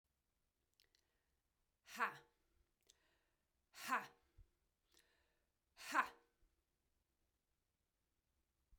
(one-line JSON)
{"exhalation_length": "8.8 s", "exhalation_amplitude": 2059, "exhalation_signal_mean_std_ratio": 0.2, "survey_phase": "beta (2021-08-13 to 2022-03-07)", "age": "45-64", "gender": "Female", "wearing_mask": "No", "symptom_runny_or_blocked_nose": true, "symptom_change_to_sense_of_smell_or_taste": true, "symptom_loss_of_taste": true, "symptom_onset": "4 days", "smoker_status": "Never smoked", "respiratory_condition_asthma": false, "respiratory_condition_other": false, "recruitment_source": "Test and Trace", "submission_delay": "2 days", "covid_test_result": "Positive", "covid_test_method": "ePCR"}